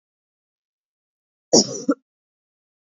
{
  "cough_length": "2.9 s",
  "cough_amplitude": 30377,
  "cough_signal_mean_std_ratio": 0.21,
  "survey_phase": "beta (2021-08-13 to 2022-03-07)",
  "age": "18-44",
  "gender": "Female",
  "wearing_mask": "No",
  "symptom_cough_any": true,
  "symptom_runny_or_blocked_nose": true,
  "symptom_shortness_of_breath": true,
  "symptom_sore_throat": true,
  "symptom_fatigue": true,
  "symptom_headache": true,
  "symptom_change_to_sense_of_smell_or_taste": true,
  "symptom_loss_of_taste": true,
  "symptom_other": true,
  "symptom_onset": "5 days",
  "smoker_status": "Never smoked",
  "respiratory_condition_asthma": false,
  "respiratory_condition_other": false,
  "recruitment_source": "Test and Trace",
  "submission_delay": "1 day",
  "covid_test_result": "Positive",
  "covid_test_method": "RT-qPCR",
  "covid_ct_value": 15.0,
  "covid_ct_gene": "ORF1ab gene"
}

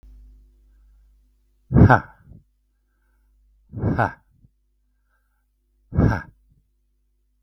{
  "exhalation_length": "7.4 s",
  "exhalation_amplitude": 32768,
  "exhalation_signal_mean_std_ratio": 0.24,
  "survey_phase": "beta (2021-08-13 to 2022-03-07)",
  "age": "65+",
  "gender": "Male",
  "wearing_mask": "No",
  "symptom_none": true,
  "smoker_status": "Never smoked",
  "respiratory_condition_asthma": false,
  "respiratory_condition_other": false,
  "recruitment_source": "REACT",
  "submission_delay": "1 day",
  "covid_test_result": "Negative",
  "covid_test_method": "RT-qPCR",
  "influenza_a_test_result": "Negative",
  "influenza_b_test_result": "Negative"
}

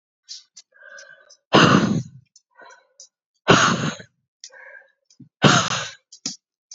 {
  "exhalation_length": "6.7 s",
  "exhalation_amplitude": 32767,
  "exhalation_signal_mean_std_ratio": 0.35,
  "survey_phase": "beta (2021-08-13 to 2022-03-07)",
  "age": "18-44",
  "gender": "Female",
  "wearing_mask": "No",
  "symptom_cough_any": true,
  "symptom_runny_or_blocked_nose": true,
  "symptom_shortness_of_breath": true,
  "symptom_sore_throat": true,
  "symptom_fatigue": true,
  "symptom_onset": "5 days",
  "smoker_status": "Never smoked",
  "respiratory_condition_asthma": false,
  "respiratory_condition_other": false,
  "recruitment_source": "Test and Trace",
  "submission_delay": "2 days",
  "covid_test_result": "Positive",
  "covid_test_method": "RT-qPCR",
  "covid_ct_value": 22.0,
  "covid_ct_gene": "N gene"
}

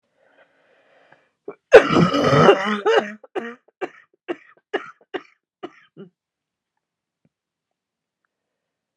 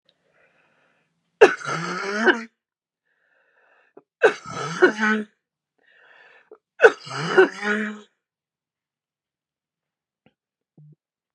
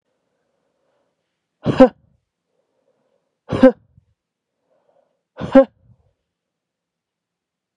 {
  "cough_length": "9.0 s",
  "cough_amplitude": 32768,
  "cough_signal_mean_std_ratio": 0.28,
  "three_cough_length": "11.3 s",
  "three_cough_amplitude": 31957,
  "three_cough_signal_mean_std_ratio": 0.28,
  "exhalation_length": "7.8 s",
  "exhalation_amplitude": 32767,
  "exhalation_signal_mean_std_ratio": 0.18,
  "survey_phase": "beta (2021-08-13 to 2022-03-07)",
  "age": "18-44",
  "gender": "Female",
  "wearing_mask": "No",
  "symptom_cough_any": true,
  "symptom_runny_or_blocked_nose": true,
  "symptom_shortness_of_breath": true,
  "symptom_sore_throat": true,
  "symptom_abdominal_pain": true,
  "symptom_fatigue": true,
  "symptom_headache": true,
  "symptom_onset": "5 days",
  "smoker_status": "Ex-smoker",
  "respiratory_condition_asthma": true,
  "respiratory_condition_other": true,
  "recruitment_source": "Test and Trace",
  "submission_delay": "2 days",
  "covid_test_result": "Negative",
  "covid_test_method": "RT-qPCR"
}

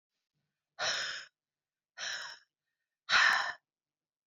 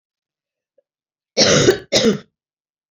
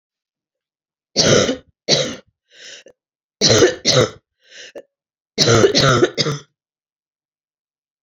{
  "exhalation_length": "4.3 s",
  "exhalation_amplitude": 6474,
  "exhalation_signal_mean_std_ratio": 0.36,
  "cough_length": "2.9 s",
  "cough_amplitude": 30909,
  "cough_signal_mean_std_ratio": 0.38,
  "three_cough_length": "8.0 s",
  "three_cough_amplitude": 32768,
  "three_cough_signal_mean_std_ratio": 0.41,
  "survey_phase": "beta (2021-08-13 to 2022-03-07)",
  "age": "18-44",
  "gender": "Female",
  "wearing_mask": "No",
  "symptom_cough_any": true,
  "symptom_change_to_sense_of_smell_or_taste": true,
  "symptom_onset": "5 days",
  "smoker_status": "Never smoked",
  "respiratory_condition_asthma": false,
  "respiratory_condition_other": false,
  "recruitment_source": "Test and Trace",
  "submission_delay": "2 days",
  "covid_test_result": "Positive",
  "covid_test_method": "RT-qPCR",
  "covid_ct_value": 15.5,
  "covid_ct_gene": "ORF1ab gene",
  "covid_ct_mean": 15.7,
  "covid_viral_load": "6800000 copies/ml",
  "covid_viral_load_category": "High viral load (>1M copies/ml)"
}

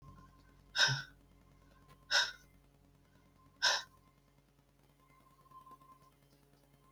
{
  "exhalation_length": "6.9 s",
  "exhalation_amplitude": 5167,
  "exhalation_signal_mean_std_ratio": 0.28,
  "survey_phase": "beta (2021-08-13 to 2022-03-07)",
  "age": "65+",
  "gender": "Female",
  "wearing_mask": "No",
  "symptom_cough_any": true,
  "symptom_runny_or_blocked_nose": true,
  "symptom_other": true,
  "smoker_status": "Never smoked",
  "respiratory_condition_asthma": true,
  "respiratory_condition_other": false,
  "recruitment_source": "Test and Trace",
  "submission_delay": "1 day",
  "covid_test_result": "Negative",
  "covid_test_method": "RT-qPCR"
}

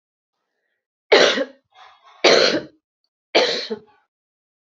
{
  "three_cough_length": "4.7 s",
  "three_cough_amplitude": 28721,
  "three_cough_signal_mean_std_ratio": 0.36,
  "survey_phase": "beta (2021-08-13 to 2022-03-07)",
  "age": "45-64",
  "gender": "Female",
  "wearing_mask": "No",
  "symptom_cough_any": true,
  "symptom_runny_or_blocked_nose": true,
  "symptom_onset": "3 days",
  "smoker_status": "Ex-smoker",
  "respiratory_condition_asthma": false,
  "respiratory_condition_other": false,
  "recruitment_source": "Test and Trace",
  "submission_delay": "2 days",
  "covid_test_result": "Positive",
  "covid_test_method": "ePCR"
}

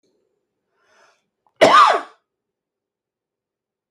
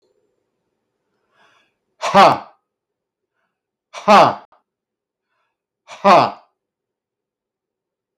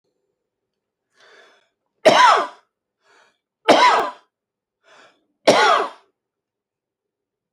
{
  "cough_length": "3.9 s",
  "cough_amplitude": 29204,
  "cough_signal_mean_std_ratio": 0.26,
  "exhalation_length": "8.2 s",
  "exhalation_amplitude": 30069,
  "exhalation_signal_mean_std_ratio": 0.25,
  "three_cough_length": "7.5 s",
  "three_cough_amplitude": 29002,
  "three_cough_signal_mean_std_ratio": 0.32,
  "survey_phase": "alpha (2021-03-01 to 2021-08-12)",
  "age": "45-64",
  "gender": "Male",
  "wearing_mask": "No",
  "symptom_none": true,
  "smoker_status": "Ex-smoker",
  "respiratory_condition_asthma": true,
  "respiratory_condition_other": false,
  "recruitment_source": "REACT",
  "submission_delay": "1 day",
  "covid_test_result": "Negative",
  "covid_test_method": "RT-qPCR"
}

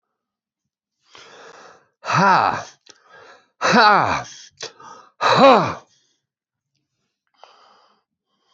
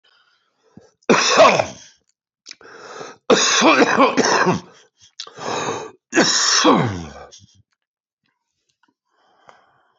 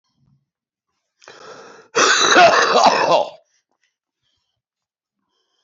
{
  "exhalation_length": "8.5 s",
  "exhalation_amplitude": 27497,
  "exhalation_signal_mean_std_ratio": 0.34,
  "three_cough_length": "10.0 s",
  "three_cough_amplitude": 29271,
  "three_cough_signal_mean_std_ratio": 0.45,
  "cough_length": "5.6 s",
  "cough_amplitude": 28487,
  "cough_signal_mean_std_ratio": 0.4,
  "survey_phase": "beta (2021-08-13 to 2022-03-07)",
  "age": "65+",
  "gender": "Male",
  "wearing_mask": "No",
  "symptom_cough_any": true,
  "symptom_shortness_of_breath": true,
  "symptom_headache": true,
  "symptom_onset": "12 days",
  "smoker_status": "Ex-smoker",
  "respiratory_condition_asthma": false,
  "respiratory_condition_other": true,
  "recruitment_source": "REACT",
  "submission_delay": "2 days",
  "covid_test_result": "Negative",
  "covid_test_method": "RT-qPCR",
  "influenza_a_test_result": "Negative",
  "influenza_b_test_result": "Negative"
}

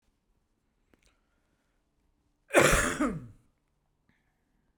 {
  "cough_length": "4.8 s",
  "cough_amplitude": 15206,
  "cough_signal_mean_std_ratio": 0.27,
  "survey_phase": "beta (2021-08-13 to 2022-03-07)",
  "age": "45-64",
  "gender": "Male",
  "wearing_mask": "No",
  "symptom_none": true,
  "smoker_status": "Ex-smoker",
  "respiratory_condition_asthma": false,
  "respiratory_condition_other": false,
  "recruitment_source": "REACT",
  "submission_delay": "1 day",
  "covid_test_result": "Negative",
  "covid_test_method": "RT-qPCR",
  "influenza_a_test_result": "Negative",
  "influenza_b_test_result": "Negative"
}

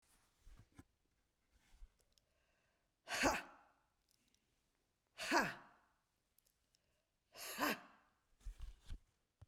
{
  "exhalation_length": "9.5 s",
  "exhalation_amplitude": 2989,
  "exhalation_signal_mean_std_ratio": 0.28,
  "survey_phase": "beta (2021-08-13 to 2022-03-07)",
  "age": "45-64",
  "gender": "Female",
  "wearing_mask": "No",
  "symptom_cough_any": true,
  "symptom_new_continuous_cough": true,
  "symptom_runny_or_blocked_nose": true,
  "symptom_fatigue": true,
  "symptom_onset": "4 days",
  "smoker_status": "Never smoked",
  "respiratory_condition_asthma": true,
  "respiratory_condition_other": false,
  "recruitment_source": "REACT",
  "submission_delay": "1 day",
  "covid_test_result": "Negative",
  "covid_test_method": "RT-qPCR",
  "influenza_a_test_result": "Unknown/Void",
  "influenza_b_test_result": "Unknown/Void"
}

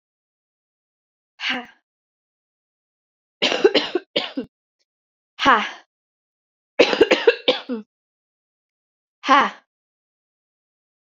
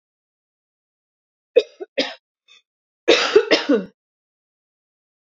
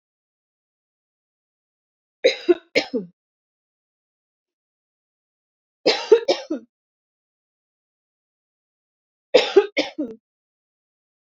{
  "exhalation_length": "11.0 s",
  "exhalation_amplitude": 32768,
  "exhalation_signal_mean_std_ratio": 0.29,
  "cough_length": "5.4 s",
  "cough_amplitude": 30971,
  "cough_signal_mean_std_ratio": 0.28,
  "three_cough_length": "11.3 s",
  "three_cough_amplitude": 27190,
  "three_cough_signal_mean_std_ratio": 0.22,
  "survey_phase": "alpha (2021-03-01 to 2021-08-12)",
  "age": "18-44",
  "gender": "Female",
  "wearing_mask": "No",
  "symptom_shortness_of_breath": true,
  "symptom_fatigue": true,
  "symptom_headache": true,
  "smoker_status": "Never smoked",
  "respiratory_condition_asthma": false,
  "respiratory_condition_other": true,
  "recruitment_source": "REACT",
  "submission_delay": "2 days",
  "covid_test_result": "Negative",
  "covid_test_method": "RT-qPCR"
}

